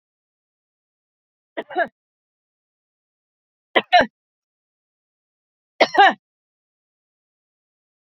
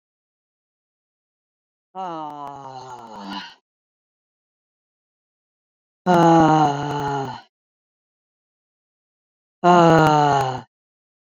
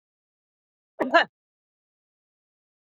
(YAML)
three_cough_length: 8.1 s
three_cough_amplitude: 28695
three_cough_signal_mean_std_ratio: 0.19
exhalation_length: 11.3 s
exhalation_amplitude: 27648
exhalation_signal_mean_std_ratio: 0.36
cough_length: 2.8 s
cough_amplitude: 18565
cough_signal_mean_std_ratio: 0.18
survey_phase: beta (2021-08-13 to 2022-03-07)
age: 45-64
gender: Female
wearing_mask: 'No'
symptom_sore_throat: true
symptom_abdominal_pain: true
symptom_fatigue: true
symptom_onset: 12 days
smoker_status: Never smoked
respiratory_condition_asthma: true
respiratory_condition_other: false
recruitment_source: REACT
submission_delay: 1 day
covid_test_result: Negative
covid_test_method: RT-qPCR
influenza_a_test_result: Negative
influenza_b_test_result: Negative